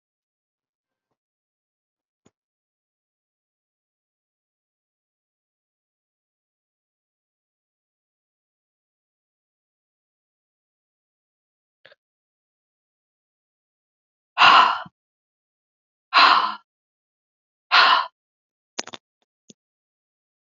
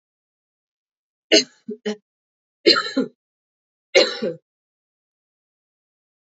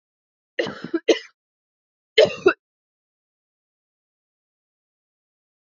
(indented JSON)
{
  "exhalation_length": "20.6 s",
  "exhalation_amplitude": 26177,
  "exhalation_signal_mean_std_ratio": 0.18,
  "three_cough_length": "6.3 s",
  "three_cough_amplitude": 29225,
  "three_cough_signal_mean_std_ratio": 0.25,
  "cough_length": "5.7 s",
  "cough_amplitude": 25888,
  "cough_signal_mean_std_ratio": 0.2,
  "survey_phase": "alpha (2021-03-01 to 2021-08-12)",
  "age": "18-44",
  "gender": "Female",
  "wearing_mask": "No",
  "symptom_cough_any": true,
  "symptom_fatigue": true,
  "symptom_onset": "2 days",
  "smoker_status": "Never smoked",
  "respiratory_condition_asthma": false,
  "respiratory_condition_other": false,
  "recruitment_source": "Test and Trace",
  "submission_delay": "2 days",
  "covid_test_result": "Positive",
  "covid_test_method": "RT-qPCR"
}